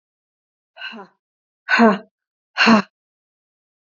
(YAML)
exhalation_length: 3.9 s
exhalation_amplitude: 26969
exhalation_signal_mean_std_ratio: 0.3
survey_phase: beta (2021-08-13 to 2022-03-07)
age: 18-44
gender: Female
wearing_mask: 'No'
symptom_cough_any: true
symptom_new_continuous_cough: true
symptom_runny_or_blocked_nose: true
symptom_sore_throat: true
symptom_abdominal_pain: true
symptom_fatigue: true
symptom_fever_high_temperature: true
symptom_other: true
smoker_status: Never smoked
respiratory_condition_asthma: false
respiratory_condition_other: false
recruitment_source: Test and Trace
submission_delay: 3 days
covid_test_result: Positive
covid_test_method: RT-qPCR
covid_ct_value: 20.7
covid_ct_gene: ORF1ab gene
covid_ct_mean: 21.2
covid_viral_load: 110000 copies/ml
covid_viral_load_category: Low viral load (10K-1M copies/ml)